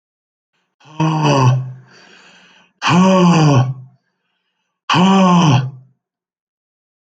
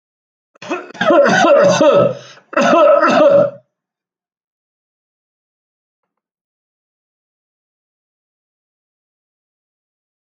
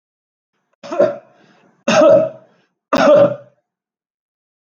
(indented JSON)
{
  "exhalation_length": "7.1 s",
  "exhalation_amplitude": 26968,
  "exhalation_signal_mean_std_ratio": 0.53,
  "cough_length": "10.2 s",
  "cough_amplitude": 28940,
  "cough_signal_mean_std_ratio": 0.4,
  "three_cough_length": "4.6 s",
  "three_cough_amplitude": 29115,
  "three_cough_signal_mean_std_ratio": 0.4,
  "survey_phase": "alpha (2021-03-01 to 2021-08-12)",
  "age": "65+",
  "gender": "Male",
  "wearing_mask": "No",
  "symptom_none": true,
  "smoker_status": "Ex-smoker",
  "respiratory_condition_asthma": false,
  "respiratory_condition_other": false,
  "recruitment_source": "REACT",
  "submission_delay": "1 day",
  "covid_test_result": "Negative",
  "covid_test_method": "RT-qPCR"
}